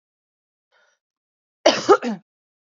{"cough_length": "2.7 s", "cough_amplitude": 27352, "cough_signal_mean_std_ratio": 0.25, "survey_phase": "beta (2021-08-13 to 2022-03-07)", "age": "18-44", "gender": "Female", "wearing_mask": "No", "symptom_cough_any": true, "symptom_runny_or_blocked_nose": true, "symptom_fatigue": true, "symptom_fever_high_temperature": true, "symptom_headache": true, "smoker_status": "Never smoked", "respiratory_condition_asthma": false, "respiratory_condition_other": false, "recruitment_source": "Test and Trace", "submission_delay": "1 day", "covid_test_result": "Positive", "covid_test_method": "RT-qPCR"}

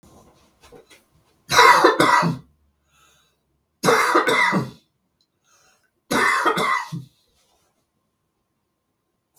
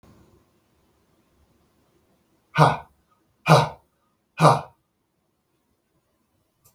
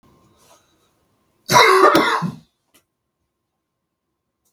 {"three_cough_length": "9.4 s", "three_cough_amplitude": 32768, "three_cough_signal_mean_std_ratio": 0.4, "exhalation_length": "6.7 s", "exhalation_amplitude": 32768, "exhalation_signal_mean_std_ratio": 0.23, "cough_length": "4.5 s", "cough_amplitude": 32768, "cough_signal_mean_std_ratio": 0.33, "survey_phase": "beta (2021-08-13 to 2022-03-07)", "age": "65+", "gender": "Male", "wearing_mask": "No", "symptom_none": true, "smoker_status": "Ex-smoker", "respiratory_condition_asthma": false, "respiratory_condition_other": false, "recruitment_source": "REACT", "submission_delay": "3 days", "covid_test_result": "Negative", "covid_test_method": "RT-qPCR", "influenza_a_test_result": "Negative", "influenza_b_test_result": "Negative"}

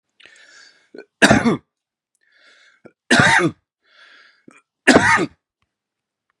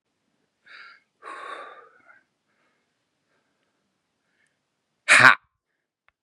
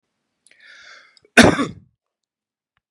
{"three_cough_length": "6.4 s", "three_cough_amplitude": 32768, "three_cough_signal_mean_std_ratio": 0.33, "exhalation_length": "6.2 s", "exhalation_amplitude": 32768, "exhalation_signal_mean_std_ratio": 0.17, "cough_length": "2.9 s", "cough_amplitude": 32768, "cough_signal_mean_std_ratio": 0.22, "survey_phase": "beta (2021-08-13 to 2022-03-07)", "age": "45-64", "gender": "Male", "wearing_mask": "No", "symptom_none": true, "symptom_onset": "8 days", "smoker_status": "Never smoked", "respiratory_condition_asthma": false, "respiratory_condition_other": false, "recruitment_source": "REACT", "submission_delay": "1 day", "covid_test_result": "Negative", "covid_test_method": "RT-qPCR", "influenza_a_test_result": "Negative", "influenza_b_test_result": "Negative"}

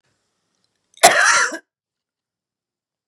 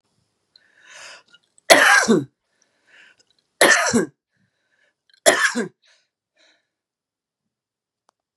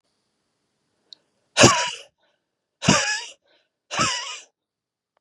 {"cough_length": "3.1 s", "cough_amplitude": 32768, "cough_signal_mean_std_ratio": 0.3, "three_cough_length": "8.4 s", "three_cough_amplitude": 32768, "three_cough_signal_mean_std_ratio": 0.3, "exhalation_length": "5.2 s", "exhalation_amplitude": 32423, "exhalation_signal_mean_std_ratio": 0.31, "survey_phase": "beta (2021-08-13 to 2022-03-07)", "age": "45-64", "gender": "Female", "wearing_mask": "No", "symptom_cough_any": true, "symptom_shortness_of_breath": true, "symptom_fatigue": true, "symptom_headache": true, "symptom_change_to_sense_of_smell_or_taste": true, "symptom_onset": "12 days", "smoker_status": "Ex-smoker", "respiratory_condition_asthma": false, "respiratory_condition_other": false, "recruitment_source": "REACT", "submission_delay": "3 days", "covid_test_result": "Negative", "covid_test_method": "RT-qPCR", "influenza_a_test_result": "Negative", "influenza_b_test_result": "Negative"}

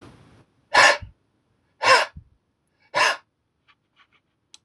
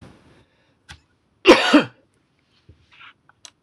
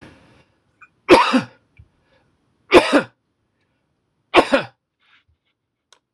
{"exhalation_length": "4.6 s", "exhalation_amplitude": 24829, "exhalation_signal_mean_std_ratio": 0.3, "cough_length": "3.6 s", "cough_amplitude": 26028, "cough_signal_mean_std_ratio": 0.24, "three_cough_length": "6.1 s", "three_cough_amplitude": 26028, "three_cough_signal_mean_std_ratio": 0.27, "survey_phase": "beta (2021-08-13 to 2022-03-07)", "age": "65+", "gender": "Male", "wearing_mask": "No", "symptom_none": true, "smoker_status": "Never smoked", "respiratory_condition_asthma": false, "respiratory_condition_other": false, "recruitment_source": "REACT", "submission_delay": "1 day", "covid_test_result": "Negative", "covid_test_method": "RT-qPCR", "influenza_a_test_result": "Negative", "influenza_b_test_result": "Negative"}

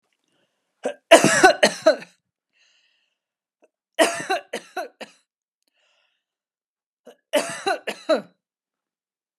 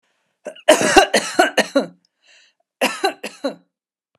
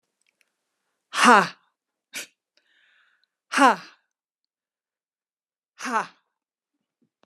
{"three_cough_length": "9.4 s", "three_cough_amplitude": 32768, "three_cough_signal_mean_std_ratio": 0.28, "cough_length": "4.2 s", "cough_amplitude": 32768, "cough_signal_mean_std_ratio": 0.38, "exhalation_length": "7.3 s", "exhalation_amplitude": 29927, "exhalation_signal_mean_std_ratio": 0.23, "survey_phase": "beta (2021-08-13 to 2022-03-07)", "age": "45-64", "gender": "Female", "wearing_mask": "Yes", "symptom_none": true, "smoker_status": "Ex-smoker", "respiratory_condition_asthma": false, "respiratory_condition_other": false, "recruitment_source": "REACT", "submission_delay": "2 days", "covid_test_result": "Negative", "covid_test_method": "RT-qPCR", "influenza_a_test_result": "Negative", "influenza_b_test_result": "Negative"}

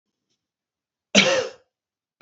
{"cough_length": "2.2 s", "cough_amplitude": 27215, "cough_signal_mean_std_ratio": 0.29, "survey_phase": "beta (2021-08-13 to 2022-03-07)", "age": "65+", "gender": "Male", "wearing_mask": "No", "symptom_none": true, "smoker_status": "Never smoked", "respiratory_condition_asthma": false, "respiratory_condition_other": false, "recruitment_source": "REACT", "submission_delay": "2 days", "covid_test_result": "Negative", "covid_test_method": "RT-qPCR"}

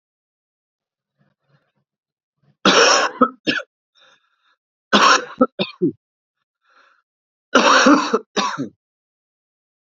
{"three_cough_length": "9.9 s", "three_cough_amplitude": 32764, "three_cough_signal_mean_std_ratio": 0.35, "survey_phase": "beta (2021-08-13 to 2022-03-07)", "age": "18-44", "gender": "Male", "wearing_mask": "No", "symptom_cough_any": true, "symptom_runny_or_blocked_nose": true, "symptom_shortness_of_breath": true, "symptom_change_to_sense_of_smell_or_taste": true, "symptom_other": true, "smoker_status": "Never smoked", "respiratory_condition_asthma": false, "respiratory_condition_other": false, "recruitment_source": "Test and Trace", "submission_delay": "1 day", "covid_test_result": "Positive", "covid_test_method": "RT-qPCR", "covid_ct_value": 22.6, "covid_ct_gene": "ORF1ab gene", "covid_ct_mean": 22.8, "covid_viral_load": "33000 copies/ml", "covid_viral_load_category": "Low viral load (10K-1M copies/ml)"}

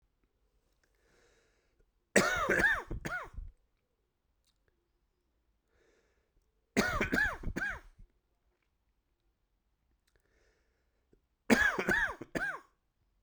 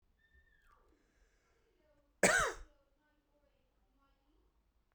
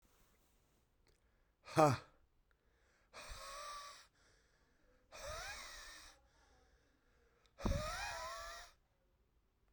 {"three_cough_length": "13.2 s", "three_cough_amplitude": 11114, "three_cough_signal_mean_std_ratio": 0.35, "cough_length": "4.9 s", "cough_amplitude": 6871, "cough_signal_mean_std_ratio": 0.21, "exhalation_length": "9.7 s", "exhalation_amplitude": 5833, "exhalation_signal_mean_std_ratio": 0.3, "survey_phase": "beta (2021-08-13 to 2022-03-07)", "age": "45-64", "gender": "Male", "wearing_mask": "No", "symptom_cough_any": true, "symptom_fatigue": true, "symptom_headache": true, "symptom_onset": "0 days", "smoker_status": "Never smoked", "respiratory_condition_asthma": false, "respiratory_condition_other": false, "recruitment_source": "Test and Trace", "submission_delay": "0 days", "covid_test_result": "Positive", "covid_test_method": "RT-qPCR", "covid_ct_value": 18.0, "covid_ct_gene": "N gene", "covid_ct_mean": 18.9, "covid_viral_load": "620000 copies/ml", "covid_viral_load_category": "Low viral load (10K-1M copies/ml)"}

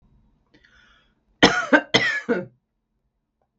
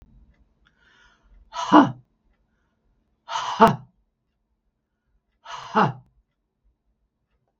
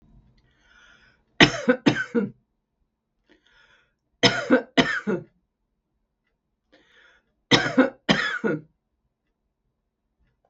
{"cough_length": "3.6 s", "cough_amplitude": 32768, "cough_signal_mean_std_ratio": 0.31, "exhalation_length": "7.6 s", "exhalation_amplitude": 32768, "exhalation_signal_mean_std_ratio": 0.23, "three_cough_length": "10.5 s", "three_cough_amplitude": 32768, "three_cough_signal_mean_std_ratio": 0.3, "survey_phase": "beta (2021-08-13 to 2022-03-07)", "age": "65+", "gender": "Female", "wearing_mask": "No", "symptom_none": true, "smoker_status": "Ex-smoker", "respiratory_condition_asthma": true, "respiratory_condition_other": false, "recruitment_source": "REACT", "submission_delay": "2 days", "covid_test_result": "Negative", "covid_test_method": "RT-qPCR", "influenza_a_test_result": "Negative", "influenza_b_test_result": "Negative"}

